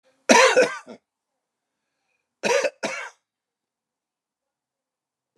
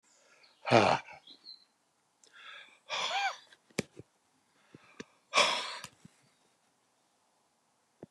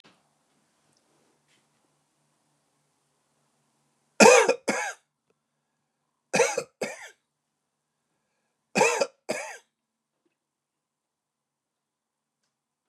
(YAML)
cough_length: 5.4 s
cough_amplitude: 32174
cough_signal_mean_std_ratio: 0.29
exhalation_length: 8.1 s
exhalation_amplitude: 12049
exhalation_signal_mean_std_ratio: 0.29
three_cough_length: 12.9 s
three_cough_amplitude: 28659
three_cough_signal_mean_std_ratio: 0.21
survey_phase: beta (2021-08-13 to 2022-03-07)
age: 65+
gender: Male
wearing_mask: 'No'
symptom_cough_any: true
smoker_status: Never smoked
respiratory_condition_asthma: false
respiratory_condition_other: false
recruitment_source: REACT
submission_delay: 7 days
covid_test_result: Negative
covid_test_method: RT-qPCR